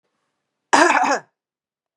cough_length: 2.0 s
cough_amplitude: 32537
cough_signal_mean_std_ratio: 0.37
survey_phase: beta (2021-08-13 to 2022-03-07)
age: 45-64
gender: Female
wearing_mask: 'No'
symptom_none: true
smoker_status: Never smoked
respiratory_condition_asthma: false
respiratory_condition_other: false
recruitment_source: REACT
submission_delay: 6 days
covid_test_result: Negative
covid_test_method: RT-qPCR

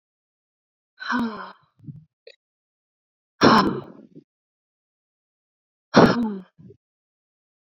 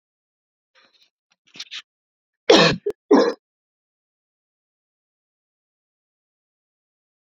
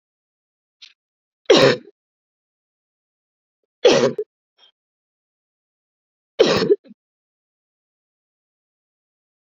exhalation_length: 7.8 s
exhalation_amplitude: 27292
exhalation_signal_mean_std_ratio: 0.27
cough_length: 7.3 s
cough_amplitude: 31704
cough_signal_mean_std_ratio: 0.21
three_cough_length: 9.6 s
three_cough_amplitude: 28390
three_cough_signal_mean_std_ratio: 0.24
survey_phase: alpha (2021-03-01 to 2021-08-12)
age: 18-44
gender: Female
wearing_mask: 'No'
symptom_cough_any: true
symptom_fatigue: true
symptom_headache: true
symptom_change_to_sense_of_smell_or_taste: true
symptom_onset: 6 days
smoker_status: Never smoked
respiratory_condition_asthma: false
respiratory_condition_other: false
recruitment_source: Test and Trace
submission_delay: 2 days
covid_test_result: Positive
covid_test_method: RT-qPCR
covid_ct_value: 31.0
covid_ct_gene: ORF1ab gene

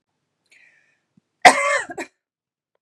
cough_length: 2.8 s
cough_amplitude: 32768
cough_signal_mean_std_ratio: 0.24
survey_phase: beta (2021-08-13 to 2022-03-07)
age: 45-64
gender: Female
wearing_mask: 'No'
symptom_cough_any: true
symptom_runny_or_blocked_nose: true
symptom_onset: 12 days
smoker_status: Ex-smoker
respiratory_condition_asthma: false
respiratory_condition_other: false
recruitment_source: REACT
submission_delay: 1 day
covid_test_result: Negative
covid_test_method: RT-qPCR
influenza_a_test_result: Negative
influenza_b_test_result: Negative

